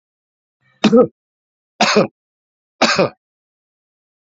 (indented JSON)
{
  "three_cough_length": "4.3 s",
  "three_cough_amplitude": 30923,
  "three_cough_signal_mean_std_ratio": 0.32,
  "survey_phase": "beta (2021-08-13 to 2022-03-07)",
  "age": "45-64",
  "gender": "Male",
  "wearing_mask": "No",
  "symptom_none": true,
  "smoker_status": "Current smoker (11 or more cigarettes per day)",
  "respiratory_condition_asthma": false,
  "respiratory_condition_other": false,
  "recruitment_source": "REACT",
  "submission_delay": "4 days",
  "covid_test_result": "Negative",
  "covid_test_method": "RT-qPCR"
}